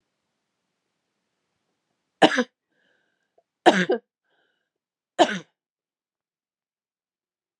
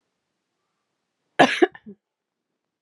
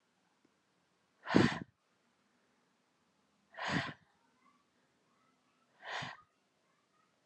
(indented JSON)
{
  "three_cough_length": "7.6 s",
  "three_cough_amplitude": 30464,
  "three_cough_signal_mean_std_ratio": 0.19,
  "cough_length": "2.8 s",
  "cough_amplitude": 30996,
  "cough_signal_mean_std_ratio": 0.2,
  "exhalation_length": "7.3 s",
  "exhalation_amplitude": 8670,
  "exhalation_signal_mean_std_ratio": 0.23,
  "survey_phase": "beta (2021-08-13 to 2022-03-07)",
  "age": "18-44",
  "gender": "Female",
  "wearing_mask": "No",
  "symptom_runny_or_blocked_nose": true,
  "symptom_fatigue": true,
  "symptom_fever_high_temperature": true,
  "symptom_headache": true,
  "symptom_loss_of_taste": true,
  "symptom_onset": "3 days",
  "smoker_status": "Ex-smoker",
  "respiratory_condition_asthma": false,
  "respiratory_condition_other": false,
  "recruitment_source": "Test and Trace",
  "submission_delay": "2 days",
  "covid_test_result": "Positive",
  "covid_test_method": "RT-qPCR",
  "covid_ct_value": 19.6,
  "covid_ct_gene": "ORF1ab gene",
  "covid_ct_mean": 20.1,
  "covid_viral_load": "260000 copies/ml",
  "covid_viral_load_category": "Low viral load (10K-1M copies/ml)"
}